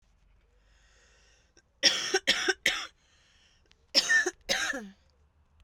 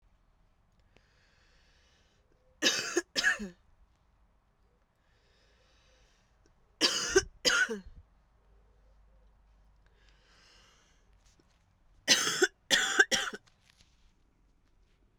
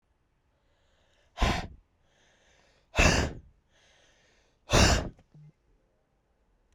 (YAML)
cough_length: 5.6 s
cough_amplitude: 14934
cough_signal_mean_std_ratio: 0.38
three_cough_length: 15.2 s
three_cough_amplitude: 12472
three_cough_signal_mean_std_ratio: 0.3
exhalation_length: 6.7 s
exhalation_amplitude: 14186
exhalation_signal_mean_std_ratio: 0.3
survey_phase: beta (2021-08-13 to 2022-03-07)
age: 18-44
gender: Female
wearing_mask: 'No'
symptom_cough_any: true
symptom_runny_or_blocked_nose: true
symptom_abdominal_pain: true
symptom_diarrhoea: true
symptom_fatigue: true
symptom_headache: true
symptom_change_to_sense_of_smell_or_taste: true
symptom_loss_of_taste: true
symptom_onset: 4 days
smoker_status: Current smoker (11 or more cigarettes per day)
respiratory_condition_asthma: true
respiratory_condition_other: false
recruitment_source: Test and Trace
submission_delay: 2 days
covid_test_result: Positive
covid_test_method: RT-qPCR
covid_ct_value: 13.6
covid_ct_gene: ORF1ab gene
covid_ct_mean: 14.0
covid_viral_load: 26000000 copies/ml
covid_viral_load_category: High viral load (>1M copies/ml)